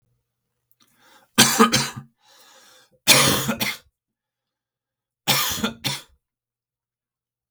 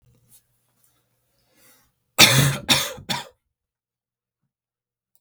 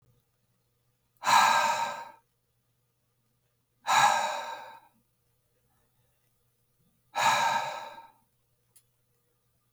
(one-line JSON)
{"three_cough_length": "7.5 s", "three_cough_amplitude": 32768, "three_cough_signal_mean_std_ratio": 0.34, "cough_length": "5.2 s", "cough_amplitude": 32768, "cough_signal_mean_std_ratio": 0.26, "exhalation_length": "9.7 s", "exhalation_amplitude": 10878, "exhalation_signal_mean_std_ratio": 0.36, "survey_phase": "beta (2021-08-13 to 2022-03-07)", "age": "18-44", "gender": "Male", "wearing_mask": "No", "symptom_none": true, "smoker_status": "Never smoked", "respiratory_condition_asthma": false, "respiratory_condition_other": false, "recruitment_source": "REACT", "submission_delay": "2 days", "covid_test_result": "Negative", "covid_test_method": "RT-qPCR", "influenza_a_test_result": "Negative", "influenza_b_test_result": "Negative"}